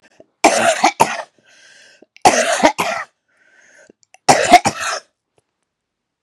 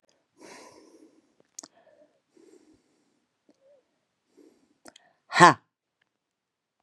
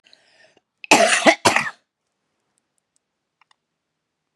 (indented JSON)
{
  "three_cough_length": "6.2 s",
  "three_cough_amplitude": 32768,
  "three_cough_signal_mean_std_ratio": 0.39,
  "exhalation_length": "6.8 s",
  "exhalation_amplitude": 32767,
  "exhalation_signal_mean_std_ratio": 0.13,
  "cough_length": "4.4 s",
  "cough_amplitude": 32767,
  "cough_signal_mean_std_ratio": 0.28,
  "survey_phase": "beta (2021-08-13 to 2022-03-07)",
  "age": "45-64",
  "gender": "Female",
  "wearing_mask": "No",
  "symptom_cough_any": true,
  "symptom_new_continuous_cough": true,
  "symptom_runny_or_blocked_nose": true,
  "symptom_sore_throat": true,
  "symptom_fatigue": true,
  "symptom_headache": true,
  "smoker_status": "Never smoked",
  "respiratory_condition_asthma": true,
  "respiratory_condition_other": false,
  "recruitment_source": "REACT",
  "submission_delay": "3 days",
  "covid_test_result": "Negative",
  "covid_test_method": "RT-qPCR"
}